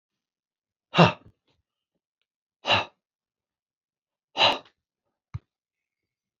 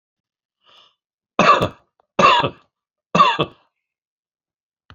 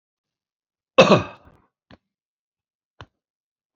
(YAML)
exhalation_length: 6.4 s
exhalation_amplitude: 26471
exhalation_signal_mean_std_ratio: 0.21
three_cough_length: 4.9 s
three_cough_amplitude: 32767
three_cough_signal_mean_std_ratio: 0.33
cough_length: 3.8 s
cough_amplitude: 30376
cough_signal_mean_std_ratio: 0.19
survey_phase: beta (2021-08-13 to 2022-03-07)
age: 45-64
gender: Male
wearing_mask: 'No'
symptom_shortness_of_breath: true
symptom_fatigue: true
smoker_status: Ex-smoker
respiratory_condition_asthma: false
respiratory_condition_other: false
recruitment_source: REACT
submission_delay: 2 days
covid_test_result: Negative
covid_test_method: RT-qPCR
influenza_a_test_result: Negative
influenza_b_test_result: Negative